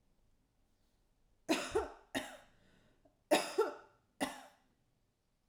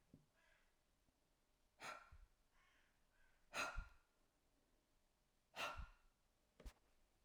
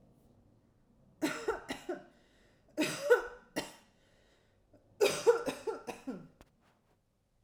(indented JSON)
{
  "cough_length": "5.5 s",
  "cough_amplitude": 4861,
  "cough_signal_mean_std_ratio": 0.32,
  "exhalation_length": "7.2 s",
  "exhalation_amplitude": 672,
  "exhalation_signal_mean_std_ratio": 0.34,
  "three_cough_length": "7.4 s",
  "three_cough_amplitude": 7367,
  "three_cough_signal_mean_std_ratio": 0.34,
  "survey_phase": "alpha (2021-03-01 to 2021-08-12)",
  "age": "45-64",
  "gender": "Female",
  "wearing_mask": "No",
  "symptom_none": true,
  "symptom_onset": "7 days",
  "smoker_status": "Never smoked",
  "respiratory_condition_asthma": false,
  "respiratory_condition_other": false,
  "recruitment_source": "REACT",
  "submission_delay": "2 days",
  "covid_test_result": "Negative",
  "covid_test_method": "RT-qPCR"
}